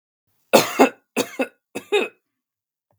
{
  "three_cough_length": "3.0 s",
  "three_cough_amplitude": 32768,
  "three_cough_signal_mean_std_ratio": 0.32,
  "survey_phase": "beta (2021-08-13 to 2022-03-07)",
  "age": "18-44",
  "gender": "Male",
  "wearing_mask": "No",
  "symptom_none": true,
  "smoker_status": "Never smoked",
  "respiratory_condition_asthma": false,
  "respiratory_condition_other": false,
  "recruitment_source": "Test and Trace",
  "submission_delay": "1 day",
  "covid_test_result": "Negative",
  "covid_test_method": "RT-qPCR"
}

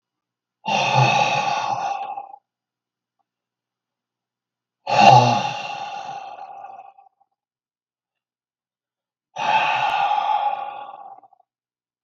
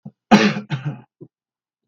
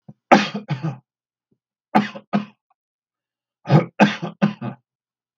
{
  "exhalation_length": "12.0 s",
  "exhalation_amplitude": 32768,
  "exhalation_signal_mean_std_ratio": 0.43,
  "cough_length": "1.9 s",
  "cough_amplitude": 32768,
  "cough_signal_mean_std_ratio": 0.35,
  "three_cough_length": "5.4 s",
  "three_cough_amplitude": 32768,
  "three_cough_signal_mean_std_ratio": 0.33,
  "survey_phase": "beta (2021-08-13 to 2022-03-07)",
  "age": "65+",
  "gender": "Male",
  "wearing_mask": "No",
  "symptom_none": true,
  "smoker_status": "Ex-smoker",
  "respiratory_condition_asthma": false,
  "respiratory_condition_other": false,
  "recruitment_source": "REACT",
  "submission_delay": "2 days",
  "covid_test_result": "Negative",
  "covid_test_method": "RT-qPCR"
}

